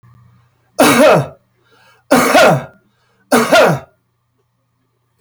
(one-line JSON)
{"three_cough_length": "5.2 s", "three_cough_amplitude": 32768, "three_cough_signal_mean_std_ratio": 0.45, "survey_phase": "beta (2021-08-13 to 2022-03-07)", "age": "45-64", "gender": "Male", "wearing_mask": "No", "symptom_cough_any": true, "smoker_status": "Current smoker (1 to 10 cigarettes per day)", "respiratory_condition_asthma": false, "respiratory_condition_other": false, "recruitment_source": "REACT", "submission_delay": "5 days", "covid_test_result": "Negative", "covid_test_method": "RT-qPCR", "influenza_a_test_result": "Negative", "influenza_b_test_result": "Negative"}